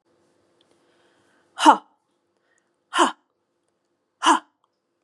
{"exhalation_length": "5.0 s", "exhalation_amplitude": 31453, "exhalation_signal_mean_std_ratio": 0.22, "survey_phase": "beta (2021-08-13 to 2022-03-07)", "age": "45-64", "gender": "Female", "wearing_mask": "No", "symptom_cough_any": true, "symptom_runny_or_blocked_nose": true, "symptom_sore_throat": true, "symptom_fatigue": true, "smoker_status": "Never smoked", "respiratory_condition_asthma": false, "respiratory_condition_other": false, "recruitment_source": "Test and Trace", "submission_delay": "2 days", "covid_test_result": "Positive", "covid_test_method": "RT-qPCR", "covid_ct_value": 28.5, "covid_ct_gene": "ORF1ab gene", "covid_ct_mean": 29.5, "covid_viral_load": "210 copies/ml", "covid_viral_load_category": "Minimal viral load (< 10K copies/ml)"}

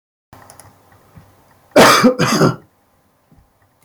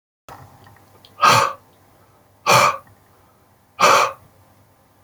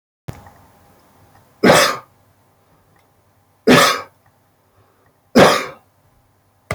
{"cough_length": "3.8 s", "cough_amplitude": 32768, "cough_signal_mean_std_ratio": 0.36, "exhalation_length": "5.0 s", "exhalation_amplitude": 28772, "exhalation_signal_mean_std_ratio": 0.36, "three_cough_length": "6.7 s", "three_cough_amplitude": 31740, "three_cough_signal_mean_std_ratio": 0.31, "survey_phase": "beta (2021-08-13 to 2022-03-07)", "age": "65+", "gender": "Male", "wearing_mask": "No", "symptom_cough_any": true, "smoker_status": "Ex-smoker", "respiratory_condition_asthma": false, "respiratory_condition_other": false, "recruitment_source": "REACT", "submission_delay": "2 days", "covid_test_result": "Negative", "covid_test_method": "RT-qPCR", "influenza_a_test_result": "Negative", "influenza_b_test_result": "Negative"}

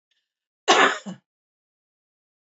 {"cough_length": "2.6 s", "cough_amplitude": 24786, "cough_signal_mean_std_ratio": 0.26, "survey_phase": "beta (2021-08-13 to 2022-03-07)", "age": "45-64", "gender": "Female", "wearing_mask": "No", "symptom_none": true, "smoker_status": "Never smoked", "respiratory_condition_asthma": false, "respiratory_condition_other": false, "recruitment_source": "REACT", "submission_delay": "3 days", "covid_test_result": "Negative", "covid_test_method": "RT-qPCR", "influenza_a_test_result": "Negative", "influenza_b_test_result": "Negative"}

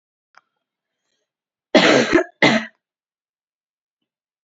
{"cough_length": "4.4 s", "cough_amplitude": 28753, "cough_signal_mean_std_ratio": 0.3, "survey_phase": "beta (2021-08-13 to 2022-03-07)", "age": "18-44", "gender": "Female", "wearing_mask": "No", "symptom_cough_any": true, "symptom_new_continuous_cough": true, "symptom_runny_or_blocked_nose": true, "symptom_sore_throat": true, "symptom_fever_high_temperature": true, "symptom_onset": "2 days", "smoker_status": "Never smoked", "respiratory_condition_asthma": false, "respiratory_condition_other": false, "recruitment_source": "Test and Trace", "submission_delay": "1 day", "covid_test_result": "Positive", "covid_test_method": "RT-qPCR", "covid_ct_value": 18.9, "covid_ct_gene": "ORF1ab gene", "covid_ct_mean": 19.1, "covid_viral_load": "550000 copies/ml", "covid_viral_load_category": "Low viral load (10K-1M copies/ml)"}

